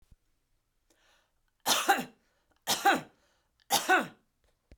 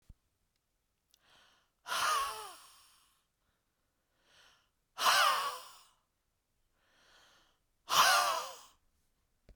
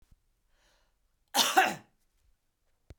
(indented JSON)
{
  "three_cough_length": "4.8 s",
  "three_cough_amplitude": 9197,
  "three_cough_signal_mean_std_ratio": 0.34,
  "exhalation_length": "9.6 s",
  "exhalation_amplitude": 6747,
  "exhalation_signal_mean_std_ratio": 0.33,
  "cough_length": "3.0 s",
  "cough_amplitude": 10383,
  "cough_signal_mean_std_ratio": 0.27,
  "survey_phase": "beta (2021-08-13 to 2022-03-07)",
  "age": "45-64",
  "gender": "Female",
  "wearing_mask": "No",
  "symptom_runny_or_blocked_nose": true,
  "symptom_onset": "4 days",
  "smoker_status": "Never smoked",
  "respiratory_condition_asthma": false,
  "respiratory_condition_other": false,
  "recruitment_source": "REACT",
  "submission_delay": "2 days",
  "covid_test_result": "Negative",
  "covid_test_method": "RT-qPCR"
}